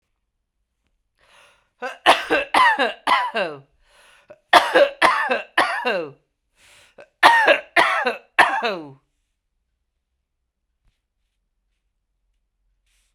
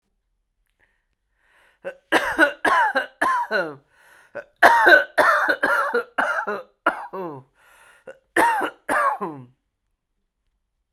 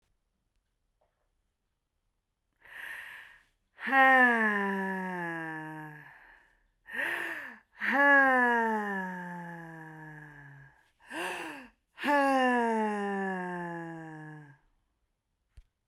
three_cough_length: 13.1 s
three_cough_amplitude: 32768
three_cough_signal_mean_std_ratio: 0.38
cough_length: 10.9 s
cough_amplitude: 32768
cough_signal_mean_std_ratio: 0.46
exhalation_length: 15.9 s
exhalation_amplitude: 10452
exhalation_signal_mean_std_ratio: 0.49
survey_phase: beta (2021-08-13 to 2022-03-07)
age: 45-64
gender: Female
wearing_mask: 'No'
symptom_none: true
smoker_status: Never smoked
respiratory_condition_asthma: false
respiratory_condition_other: false
recruitment_source: REACT
submission_delay: 2 days
covid_test_result: Negative
covid_test_method: RT-qPCR
influenza_a_test_result: Negative
influenza_b_test_result: Negative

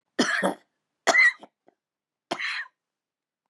three_cough_length: 3.5 s
three_cough_amplitude: 18034
three_cough_signal_mean_std_ratio: 0.37
survey_phase: beta (2021-08-13 to 2022-03-07)
age: 65+
gender: Female
wearing_mask: 'No'
symptom_shortness_of_breath: true
symptom_fatigue: true
smoker_status: Ex-smoker
respiratory_condition_asthma: true
respiratory_condition_other: false
recruitment_source: REACT
submission_delay: 2 days
covid_test_result: Negative
covid_test_method: RT-qPCR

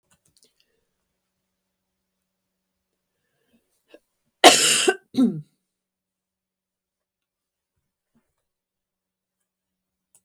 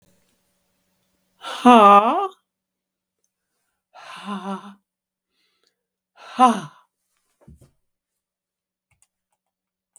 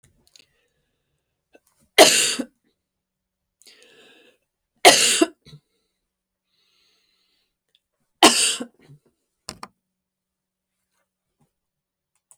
cough_length: 10.2 s
cough_amplitude: 32768
cough_signal_mean_std_ratio: 0.18
exhalation_length: 10.0 s
exhalation_amplitude: 32766
exhalation_signal_mean_std_ratio: 0.23
three_cough_length: 12.4 s
three_cough_amplitude: 32768
three_cough_signal_mean_std_ratio: 0.21
survey_phase: beta (2021-08-13 to 2022-03-07)
age: 65+
gender: Female
wearing_mask: 'No'
symptom_runny_or_blocked_nose: true
smoker_status: Never smoked
respiratory_condition_asthma: false
respiratory_condition_other: false
recruitment_source: Test and Trace
submission_delay: 1 day
covid_test_result: Negative
covid_test_method: RT-qPCR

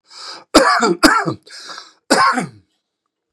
cough_length: 3.3 s
cough_amplitude: 32768
cough_signal_mean_std_ratio: 0.47
survey_phase: beta (2021-08-13 to 2022-03-07)
age: 65+
gender: Male
wearing_mask: 'No'
symptom_none: true
smoker_status: Ex-smoker
respiratory_condition_asthma: false
respiratory_condition_other: false
recruitment_source: REACT
submission_delay: 2 days
covid_test_result: Negative
covid_test_method: RT-qPCR
influenza_a_test_result: Negative
influenza_b_test_result: Negative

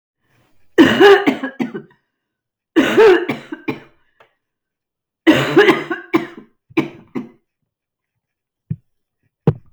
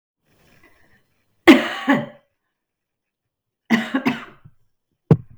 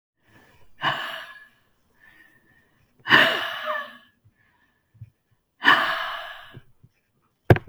three_cough_length: 9.7 s
three_cough_amplitude: 32768
three_cough_signal_mean_std_ratio: 0.37
cough_length: 5.4 s
cough_amplitude: 32768
cough_signal_mean_std_ratio: 0.27
exhalation_length: 7.7 s
exhalation_amplitude: 32766
exhalation_signal_mean_std_ratio: 0.32
survey_phase: beta (2021-08-13 to 2022-03-07)
age: 45-64
gender: Female
wearing_mask: 'No'
symptom_cough_any: true
symptom_runny_or_blocked_nose: true
symptom_sore_throat: true
smoker_status: Never smoked
respiratory_condition_asthma: false
respiratory_condition_other: false
recruitment_source: Test and Trace
submission_delay: 2 days
covid_test_result: Positive
covid_test_method: LFT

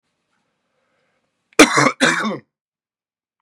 cough_length: 3.4 s
cough_amplitude: 32768
cough_signal_mean_std_ratio: 0.3
survey_phase: beta (2021-08-13 to 2022-03-07)
age: 45-64
gender: Male
wearing_mask: 'No'
symptom_cough_any: true
symptom_new_continuous_cough: true
symptom_sore_throat: true
symptom_fatigue: true
smoker_status: Never smoked
respiratory_condition_asthma: false
respiratory_condition_other: false
recruitment_source: Test and Trace
submission_delay: 2 days
covid_test_result: Positive
covid_test_method: LFT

